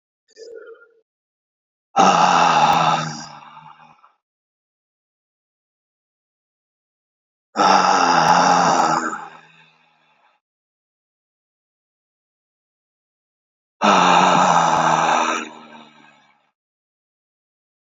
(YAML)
exhalation_length: 17.9 s
exhalation_amplitude: 26489
exhalation_signal_mean_std_ratio: 0.42
survey_phase: beta (2021-08-13 to 2022-03-07)
age: 18-44
gender: Male
wearing_mask: 'No'
symptom_cough_any: true
symptom_runny_or_blocked_nose: true
symptom_fatigue: true
symptom_other: true
symptom_onset: 4 days
smoker_status: Ex-smoker
respiratory_condition_asthma: false
respiratory_condition_other: false
recruitment_source: Test and Trace
submission_delay: 2 days
covid_test_result: Positive
covid_test_method: RT-qPCR
covid_ct_value: 14.2
covid_ct_gene: ORF1ab gene
covid_ct_mean: 14.6
covid_viral_load: 16000000 copies/ml
covid_viral_load_category: High viral load (>1M copies/ml)